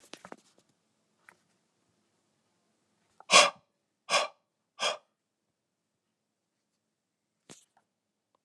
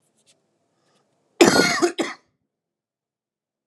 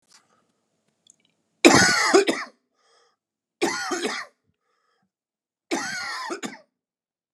{"exhalation_length": "8.4 s", "exhalation_amplitude": 19300, "exhalation_signal_mean_std_ratio": 0.17, "cough_length": "3.7 s", "cough_amplitude": 32763, "cough_signal_mean_std_ratio": 0.29, "three_cough_length": "7.3 s", "three_cough_amplitude": 32768, "three_cough_signal_mean_std_ratio": 0.34, "survey_phase": "alpha (2021-03-01 to 2021-08-12)", "age": "45-64", "gender": "Male", "wearing_mask": "No", "symptom_cough_any": true, "symptom_headache": true, "symptom_onset": "13 days", "smoker_status": "Never smoked", "respiratory_condition_asthma": false, "respiratory_condition_other": false, "recruitment_source": "REACT", "submission_delay": "1 day", "covid_test_result": "Negative", "covid_test_method": "RT-qPCR"}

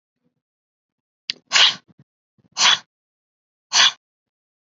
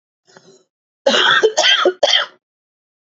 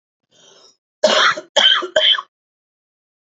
{"exhalation_length": "4.7 s", "exhalation_amplitude": 31593, "exhalation_signal_mean_std_ratio": 0.27, "cough_length": "3.1 s", "cough_amplitude": 30999, "cough_signal_mean_std_ratio": 0.49, "three_cough_length": "3.2 s", "three_cough_amplitude": 32768, "three_cough_signal_mean_std_ratio": 0.43, "survey_phase": "beta (2021-08-13 to 2022-03-07)", "age": "18-44", "gender": "Female", "wearing_mask": "No", "symptom_runny_or_blocked_nose": true, "symptom_fatigue": true, "symptom_headache": true, "symptom_onset": "12 days", "smoker_status": "Current smoker (11 or more cigarettes per day)", "respiratory_condition_asthma": false, "respiratory_condition_other": false, "recruitment_source": "REACT", "submission_delay": "1 day", "covid_test_result": "Negative", "covid_test_method": "RT-qPCR", "influenza_a_test_result": "Negative", "influenza_b_test_result": "Negative"}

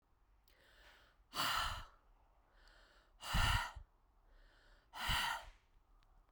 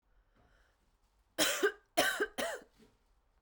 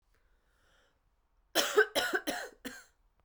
{"exhalation_length": "6.3 s", "exhalation_amplitude": 2493, "exhalation_signal_mean_std_ratio": 0.41, "three_cough_length": "3.4 s", "three_cough_amplitude": 7113, "three_cough_signal_mean_std_ratio": 0.38, "cough_length": "3.2 s", "cough_amplitude": 7843, "cough_signal_mean_std_ratio": 0.35, "survey_phase": "beta (2021-08-13 to 2022-03-07)", "age": "45-64", "gender": "Female", "wearing_mask": "No", "symptom_cough_any": true, "symptom_new_continuous_cough": true, "symptom_runny_or_blocked_nose": true, "symptom_fatigue": true, "symptom_headache": true, "symptom_change_to_sense_of_smell_or_taste": true, "symptom_loss_of_taste": true, "symptom_other": true, "symptom_onset": "3 days", "smoker_status": "Never smoked", "respiratory_condition_asthma": false, "respiratory_condition_other": false, "recruitment_source": "Test and Trace", "submission_delay": "2 days", "covid_test_result": "Positive", "covid_test_method": "RT-qPCR", "covid_ct_value": 19.0, "covid_ct_gene": "ORF1ab gene"}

